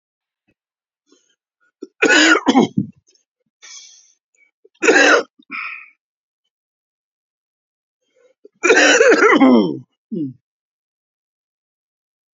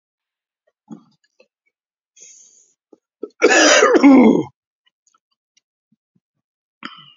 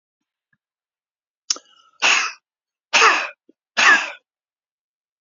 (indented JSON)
{
  "three_cough_length": "12.4 s",
  "three_cough_amplitude": 32345,
  "three_cough_signal_mean_std_ratio": 0.36,
  "cough_length": "7.2 s",
  "cough_amplitude": 31777,
  "cough_signal_mean_std_ratio": 0.31,
  "exhalation_length": "5.2 s",
  "exhalation_amplitude": 29975,
  "exhalation_signal_mean_std_ratio": 0.32,
  "survey_phase": "beta (2021-08-13 to 2022-03-07)",
  "age": "65+",
  "gender": "Male",
  "wearing_mask": "No",
  "symptom_none": true,
  "smoker_status": "Ex-smoker",
  "respiratory_condition_asthma": false,
  "respiratory_condition_other": true,
  "recruitment_source": "REACT",
  "submission_delay": "2 days",
  "covid_test_result": "Negative",
  "covid_test_method": "RT-qPCR",
  "influenza_a_test_result": "Negative",
  "influenza_b_test_result": "Negative"
}